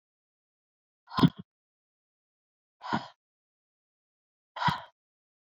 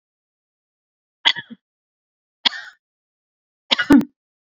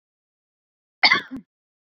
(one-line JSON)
{"exhalation_length": "5.5 s", "exhalation_amplitude": 12599, "exhalation_signal_mean_std_ratio": 0.2, "three_cough_length": "4.5 s", "three_cough_amplitude": 32768, "three_cough_signal_mean_std_ratio": 0.21, "cough_length": "2.0 s", "cough_amplitude": 27746, "cough_signal_mean_std_ratio": 0.23, "survey_phase": "beta (2021-08-13 to 2022-03-07)", "age": "18-44", "gender": "Female", "wearing_mask": "No", "symptom_fatigue": true, "symptom_headache": true, "smoker_status": "Never smoked", "respiratory_condition_asthma": false, "respiratory_condition_other": false, "recruitment_source": "REACT", "submission_delay": "2 days", "covid_test_result": "Negative", "covid_test_method": "RT-qPCR"}